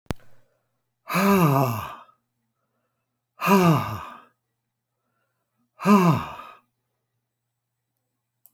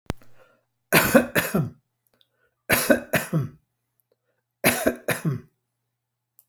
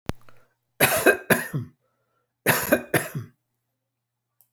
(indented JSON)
{
  "exhalation_length": "8.5 s",
  "exhalation_amplitude": 20754,
  "exhalation_signal_mean_std_ratio": 0.36,
  "three_cough_length": "6.5 s",
  "three_cough_amplitude": 27900,
  "three_cough_signal_mean_std_ratio": 0.39,
  "cough_length": "4.5 s",
  "cough_amplitude": 25354,
  "cough_signal_mean_std_ratio": 0.37,
  "survey_phase": "alpha (2021-03-01 to 2021-08-12)",
  "age": "65+",
  "gender": "Male",
  "wearing_mask": "No",
  "symptom_none": true,
  "smoker_status": "Never smoked",
  "respiratory_condition_asthma": true,
  "respiratory_condition_other": false,
  "recruitment_source": "REACT",
  "submission_delay": "1 day",
  "covid_test_result": "Negative",
  "covid_test_method": "RT-qPCR"
}